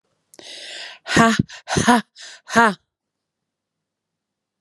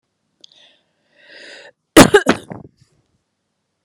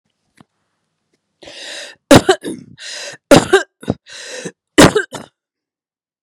{"exhalation_length": "4.6 s", "exhalation_amplitude": 32766, "exhalation_signal_mean_std_ratio": 0.33, "cough_length": "3.8 s", "cough_amplitude": 32768, "cough_signal_mean_std_ratio": 0.21, "three_cough_length": "6.2 s", "three_cough_amplitude": 32768, "three_cough_signal_mean_std_ratio": 0.29, "survey_phase": "beta (2021-08-13 to 2022-03-07)", "age": "45-64", "gender": "Female", "wearing_mask": "No", "symptom_cough_any": true, "symptom_runny_or_blocked_nose": true, "symptom_sore_throat": true, "smoker_status": "Never smoked", "respiratory_condition_asthma": false, "respiratory_condition_other": false, "recruitment_source": "REACT", "submission_delay": "1 day", "covid_test_result": "Negative", "covid_test_method": "RT-qPCR", "influenza_a_test_result": "Negative", "influenza_b_test_result": "Negative"}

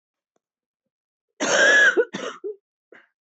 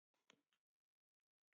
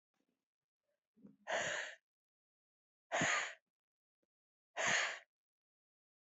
{"cough_length": "3.2 s", "cough_amplitude": 15273, "cough_signal_mean_std_ratio": 0.41, "three_cough_length": "1.5 s", "three_cough_amplitude": 142, "three_cough_signal_mean_std_ratio": 0.16, "exhalation_length": "6.3 s", "exhalation_amplitude": 2680, "exhalation_signal_mean_std_ratio": 0.35, "survey_phase": "beta (2021-08-13 to 2022-03-07)", "age": "45-64", "gender": "Female", "wearing_mask": "No", "symptom_cough_any": true, "symptom_new_continuous_cough": true, "symptom_shortness_of_breath": true, "symptom_sore_throat": true, "symptom_fatigue": true, "symptom_fever_high_temperature": true, "symptom_headache": true, "symptom_change_to_sense_of_smell_or_taste": true, "symptom_loss_of_taste": true, "symptom_onset": "2 days", "smoker_status": "Ex-smoker", "respiratory_condition_asthma": true, "respiratory_condition_other": false, "recruitment_source": "Test and Trace", "submission_delay": "2 days", "covid_test_result": "Positive", "covid_test_method": "RT-qPCR", "covid_ct_value": 14.7, "covid_ct_gene": "ORF1ab gene", "covid_ct_mean": 15.9, "covid_viral_load": "6200000 copies/ml", "covid_viral_load_category": "High viral load (>1M copies/ml)"}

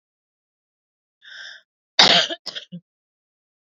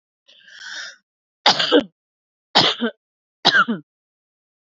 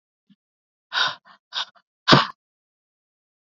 {"cough_length": "3.7 s", "cough_amplitude": 29522, "cough_signal_mean_std_ratio": 0.25, "three_cough_length": "4.6 s", "three_cough_amplitude": 31597, "three_cough_signal_mean_std_ratio": 0.35, "exhalation_length": "3.4 s", "exhalation_amplitude": 27656, "exhalation_signal_mean_std_ratio": 0.25, "survey_phase": "beta (2021-08-13 to 2022-03-07)", "age": "18-44", "gender": "Female", "wearing_mask": "No", "symptom_cough_any": true, "smoker_status": "Never smoked", "respiratory_condition_asthma": false, "respiratory_condition_other": false, "recruitment_source": "REACT", "submission_delay": "1 day", "covid_test_result": "Negative", "covid_test_method": "RT-qPCR", "influenza_a_test_result": "Unknown/Void", "influenza_b_test_result": "Unknown/Void"}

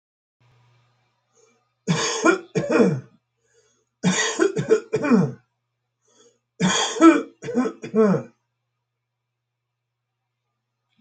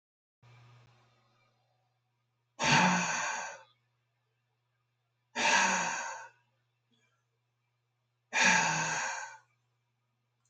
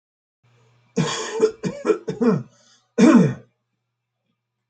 {"three_cough_length": "11.0 s", "three_cough_amplitude": 26921, "three_cough_signal_mean_std_ratio": 0.4, "exhalation_length": "10.5 s", "exhalation_amplitude": 8679, "exhalation_signal_mean_std_ratio": 0.39, "cough_length": "4.7 s", "cough_amplitude": 24235, "cough_signal_mean_std_ratio": 0.4, "survey_phase": "alpha (2021-03-01 to 2021-08-12)", "age": "65+", "gender": "Male", "wearing_mask": "No", "symptom_none": true, "smoker_status": "Never smoked", "respiratory_condition_asthma": true, "respiratory_condition_other": false, "recruitment_source": "REACT", "submission_delay": "7 days", "covid_test_result": "Negative", "covid_test_method": "RT-qPCR"}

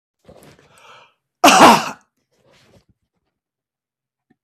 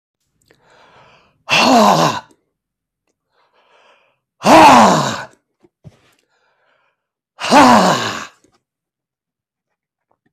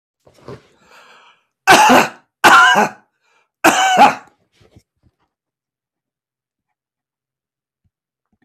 {"cough_length": "4.4 s", "cough_amplitude": 32768, "cough_signal_mean_std_ratio": 0.25, "exhalation_length": "10.3 s", "exhalation_amplitude": 32768, "exhalation_signal_mean_std_ratio": 0.36, "three_cough_length": "8.4 s", "three_cough_amplitude": 32768, "three_cough_signal_mean_std_ratio": 0.33, "survey_phase": "beta (2021-08-13 to 2022-03-07)", "age": "45-64", "gender": "Male", "wearing_mask": "No", "symptom_none": true, "symptom_onset": "6 days", "smoker_status": "Never smoked", "respiratory_condition_asthma": false, "respiratory_condition_other": false, "recruitment_source": "REACT", "submission_delay": "2 days", "covid_test_result": "Negative", "covid_test_method": "RT-qPCR", "influenza_a_test_result": "Negative", "influenza_b_test_result": "Negative"}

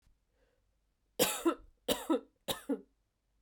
{"three_cough_length": "3.4 s", "three_cough_amplitude": 5914, "three_cough_signal_mean_std_ratio": 0.36, "survey_phase": "beta (2021-08-13 to 2022-03-07)", "age": "18-44", "gender": "Female", "wearing_mask": "No", "symptom_cough_any": true, "symptom_runny_or_blocked_nose": true, "symptom_change_to_sense_of_smell_or_taste": true, "symptom_loss_of_taste": true, "symptom_onset": "4 days", "smoker_status": "Ex-smoker", "respiratory_condition_asthma": false, "respiratory_condition_other": false, "recruitment_source": "Test and Trace", "submission_delay": "3 days", "covid_test_result": "Positive", "covid_test_method": "RT-qPCR", "covid_ct_value": 14.7, "covid_ct_gene": "ORF1ab gene", "covid_ct_mean": 15.7, "covid_viral_load": "7100000 copies/ml", "covid_viral_load_category": "High viral load (>1M copies/ml)"}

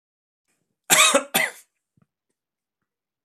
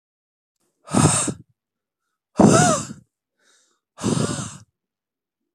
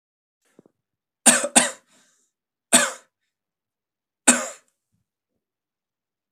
{"cough_length": "3.2 s", "cough_amplitude": 30868, "cough_signal_mean_std_ratio": 0.29, "exhalation_length": "5.5 s", "exhalation_amplitude": 25460, "exhalation_signal_mean_std_ratio": 0.36, "three_cough_length": "6.3 s", "three_cough_amplitude": 32768, "three_cough_signal_mean_std_ratio": 0.23, "survey_phase": "beta (2021-08-13 to 2022-03-07)", "age": "18-44", "gender": "Male", "wearing_mask": "No", "symptom_none": true, "smoker_status": "Never smoked", "respiratory_condition_asthma": false, "respiratory_condition_other": false, "recruitment_source": "REACT", "submission_delay": "2 days", "covid_test_result": "Negative", "covid_test_method": "RT-qPCR", "influenza_a_test_result": "Negative", "influenza_b_test_result": "Negative"}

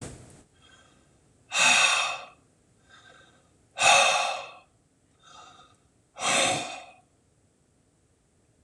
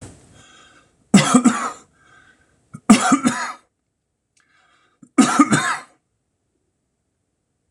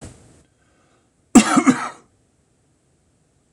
{"exhalation_length": "8.6 s", "exhalation_amplitude": 16319, "exhalation_signal_mean_std_ratio": 0.38, "three_cough_length": "7.7 s", "three_cough_amplitude": 26028, "three_cough_signal_mean_std_ratio": 0.33, "cough_length": "3.5 s", "cough_amplitude": 26028, "cough_signal_mean_std_ratio": 0.26, "survey_phase": "beta (2021-08-13 to 2022-03-07)", "age": "45-64", "gender": "Male", "wearing_mask": "No", "symptom_shortness_of_breath": true, "symptom_fatigue": true, "symptom_onset": "12 days", "smoker_status": "Ex-smoker", "respiratory_condition_asthma": false, "respiratory_condition_other": false, "recruitment_source": "REACT", "submission_delay": "2 days", "covid_test_result": "Negative", "covid_test_method": "RT-qPCR", "influenza_a_test_result": "Negative", "influenza_b_test_result": "Negative"}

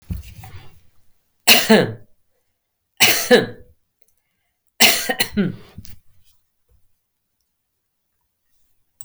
{"three_cough_length": "9.0 s", "three_cough_amplitude": 32768, "three_cough_signal_mean_std_ratio": 0.31, "survey_phase": "beta (2021-08-13 to 2022-03-07)", "age": "45-64", "gender": "Female", "wearing_mask": "No", "symptom_none": true, "smoker_status": "Never smoked", "respiratory_condition_asthma": false, "respiratory_condition_other": false, "recruitment_source": "REACT", "submission_delay": "1 day", "covid_test_result": "Negative", "covid_test_method": "RT-qPCR"}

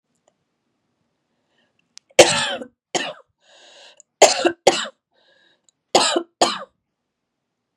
{"three_cough_length": "7.8 s", "three_cough_amplitude": 32768, "three_cough_signal_mean_std_ratio": 0.28, "survey_phase": "beta (2021-08-13 to 2022-03-07)", "age": "45-64", "gender": "Female", "wearing_mask": "No", "symptom_cough_any": true, "symptom_runny_or_blocked_nose": true, "symptom_sore_throat": true, "symptom_abdominal_pain": true, "symptom_diarrhoea": true, "symptom_fatigue": true, "symptom_fever_high_temperature": true, "symptom_headache": true, "symptom_change_to_sense_of_smell_or_taste": true, "smoker_status": "Never smoked", "respiratory_condition_asthma": false, "respiratory_condition_other": false, "recruitment_source": "Test and Trace", "submission_delay": "2 days", "covid_test_result": "Positive", "covid_test_method": "RT-qPCR", "covid_ct_value": 24.0, "covid_ct_gene": "ORF1ab gene"}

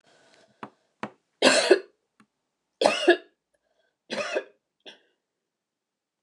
{"three_cough_length": "6.2 s", "three_cough_amplitude": 24728, "three_cough_signal_mean_std_ratio": 0.28, "survey_phase": "beta (2021-08-13 to 2022-03-07)", "age": "65+", "gender": "Female", "wearing_mask": "No", "symptom_none": true, "symptom_onset": "12 days", "smoker_status": "Ex-smoker", "respiratory_condition_asthma": false, "respiratory_condition_other": false, "recruitment_source": "REACT", "submission_delay": "1 day", "covid_test_result": "Negative", "covid_test_method": "RT-qPCR"}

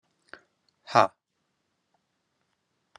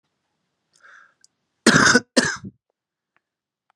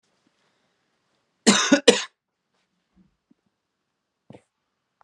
{"exhalation_length": "3.0 s", "exhalation_amplitude": 22695, "exhalation_signal_mean_std_ratio": 0.14, "cough_length": "3.8 s", "cough_amplitude": 31846, "cough_signal_mean_std_ratio": 0.28, "three_cough_length": "5.0 s", "three_cough_amplitude": 32744, "three_cough_signal_mean_std_ratio": 0.21, "survey_phase": "beta (2021-08-13 to 2022-03-07)", "age": "45-64", "gender": "Male", "wearing_mask": "No", "symptom_none": true, "smoker_status": "Never smoked", "respiratory_condition_asthma": false, "respiratory_condition_other": false, "recruitment_source": "REACT", "submission_delay": "4 days", "covid_test_result": "Negative", "covid_test_method": "RT-qPCR"}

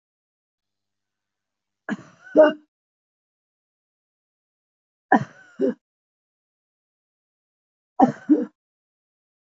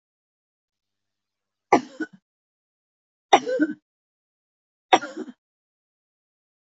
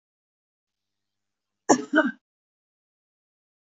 {"exhalation_length": "9.5 s", "exhalation_amplitude": 24935, "exhalation_signal_mean_std_ratio": 0.2, "three_cough_length": "6.7 s", "three_cough_amplitude": 27186, "three_cough_signal_mean_std_ratio": 0.2, "cough_length": "3.7 s", "cough_amplitude": 24971, "cough_signal_mean_std_ratio": 0.2, "survey_phase": "beta (2021-08-13 to 2022-03-07)", "age": "45-64", "gender": "Female", "wearing_mask": "No", "symptom_none": true, "smoker_status": "Never smoked", "respiratory_condition_asthma": false, "respiratory_condition_other": false, "recruitment_source": "REACT", "submission_delay": "3 days", "covid_test_result": "Negative", "covid_test_method": "RT-qPCR", "influenza_a_test_result": "Negative", "influenza_b_test_result": "Negative"}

